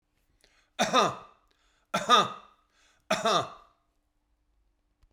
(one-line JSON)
{"three_cough_length": "5.1 s", "three_cough_amplitude": 12387, "three_cough_signal_mean_std_ratio": 0.34, "survey_phase": "beta (2021-08-13 to 2022-03-07)", "age": "45-64", "gender": "Male", "wearing_mask": "No", "symptom_none": true, "smoker_status": "Ex-smoker", "respiratory_condition_asthma": false, "respiratory_condition_other": false, "recruitment_source": "REACT", "submission_delay": "3 days", "covid_test_result": "Negative", "covid_test_method": "RT-qPCR", "influenza_a_test_result": "Negative", "influenza_b_test_result": "Negative"}